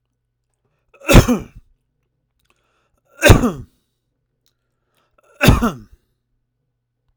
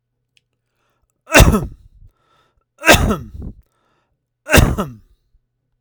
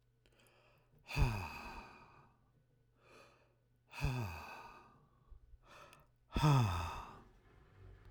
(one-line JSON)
{"cough_length": "7.2 s", "cough_amplitude": 32768, "cough_signal_mean_std_ratio": 0.25, "three_cough_length": "5.8 s", "three_cough_amplitude": 32768, "three_cough_signal_mean_std_ratio": 0.31, "exhalation_length": "8.1 s", "exhalation_amplitude": 3226, "exhalation_signal_mean_std_ratio": 0.38, "survey_phase": "alpha (2021-03-01 to 2021-08-12)", "age": "45-64", "gender": "Male", "wearing_mask": "No", "symptom_none": true, "symptom_onset": "7 days", "smoker_status": "Never smoked", "respiratory_condition_asthma": false, "respiratory_condition_other": false, "recruitment_source": "REACT", "submission_delay": "2 days", "covid_test_result": "Negative", "covid_test_method": "RT-qPCR"}